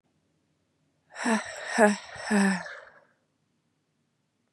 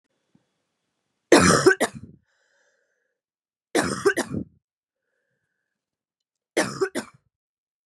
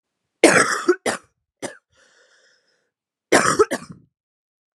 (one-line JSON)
{"exhalation_length": "4.5 s", "exhalation_amplitude": 19697, "exhalation_signal_mean_std_ratio": 0.37, "three_cough_length": "7.9 s", "three_cough_amplitude": 26424, "three_cough_signal_mean_std_ratio": 0.28, "cough_length": "4.8 s", "cough_amplitude": 32347, "cough_signal_mean_std_ratio": 0.32, "survey_phase": "beta (2021-08-13 to 2022-03-07)", "age": "18-44", "gender": "Female", "wearing_mask": "No", "symptom_cough_any": true, "symptom_new_continuous_cough": true, "symptom_runny_or_blocked_nose": true, "symptom_shortness_of_breath": true, "symptom_sore_throat": true, "symptom_fatigue": true, "symptom_fever_high_temperature": true, "symptom_headache": true, "symptom_change_to_sense_of_smell_or_taste": true, "symptom_loss_of_taste": true, "symptom_other": true, "symptom_onset": "2 days", "smoker_status": "Current smoker (e-cigarettes or vapes only)", "respiratory_condition_asthma": false, "respiratory_condition_other": false, "recruitment_source": "Test and Trace", "submission_delay": "2 days", "covid_test_result": "Positive", "covid_test_method": "RT-qPCR", "covid_ct_value": 15.0, "covid_ct_gene": "ORF1ab gene", "covid_ct_mean": 15.1, "covid_viral_load": "11000000 copies/ml", "covid_viral_load_category": "High viral load (>1M copies/ml)"}